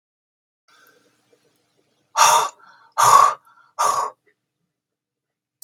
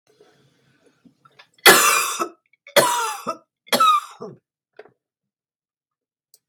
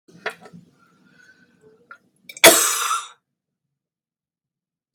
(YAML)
exhalation_length: 5.6 s
exhalation_amplitude: 32573
exhalation_signal_mean_std_ratio: 0.32
three_cough_length: 6.5 s
three_cough_amplitude: 32768
three_cough_signal_mean_std_ratio: 0.34
cough_length: 4.9 s
cough_amplitude: 32768
cough_signal_mean_std_ratio: 0.24
survey_phase: beta (2021-08-13 to 2022-03-07)
age: 45-64
gender: Female
wearing_mask: 'No'
symptom_runny_or_blocked_nose: true
symptom_headache: true
smoker_status: Current smoker (11 or more cigarettes per day)
respiratory_condition_asthma: false
respiratory_condition_other: false
recruitment_source: REACT
submission_delay: 1 day
covid_test_result: Negative
covid_test_method: RT-qPCR
influenza_a_test_result: Negative
influenza_b_test_result: Negative